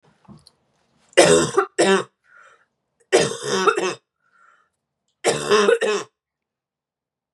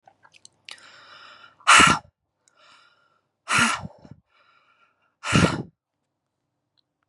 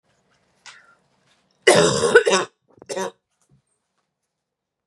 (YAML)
three_cough_length: 7.3 s
three_cough_amplitude: 32767
three_cough_signal_mean_std_ratio: 0.41
exhalation_length: 7.1 s
exhalation_amplitude: 28240
exhalation_signal_mean_std_ratio: 0.28
cough_length: 4.9 s
cough_amplitude: 32456
cough_signal_mean_std_ratio: 0.31
survey_phase: beta (2021-08-13 to 2022-03-07)
age: 18-44
gender: Female
wearing_mask: 'No'
symptom_new_continuous_cough: true
symptom_shortness_of_breath: true
symptom_sore_throat: true
symptom_change_to_sense_of_smell_or_taste: true
symptom_onset: 6 days
smoker_status: Never smoked
respiratory_condition_asthma: false
respiratory_condition_other: false
recruitment_source: Test and Trace
submission_delay: 2 days
covid_test_result: Positive
covid_test_method: RT-qPCR